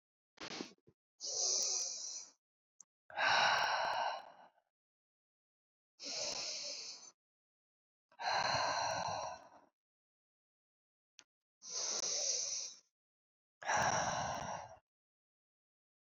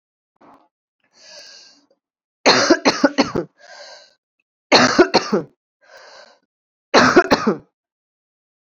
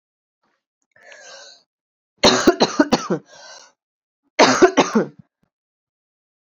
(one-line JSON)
{"exhalation_length": "16.0 s", "exhalation_amplitude": 3706, "exhalation_signal_mean_std_ratio": 0.51, "three_cough_length": "8.8 s", "three_cough_amplitude": 32768, "three_cough_signal_mean_std_ratio": 0.34, "cough_length": "6.5 s", "cough_amplitude": 31612, "cough_signal_mean_std_ratio": 0.32, "survey_phase": "beta (2021-08-13 to 2022-03-07)", "age": "18-44", "gender": "Female", "wearing_mask": "No", "symptom_cough_any": true, "symptom_new_continuous_cough": true, "symptom_runny_or_blocked_nose": true, "symptom_sore_throat": true, "symptom_fatigue": true, "symptom_fever_high_temperature": true, "symptom_headache": true, "symptom_other": true, "symptom_onset": "3 days", "smoker_status": "Never smoked", "respiratory_condition_asthma": false, "respiratory_condition_other": false, "recruitment_source": "Test and Trace", "submission_delay": "1 day", "covid_test_result": "Positive", "covid_test_method": "LAMP"}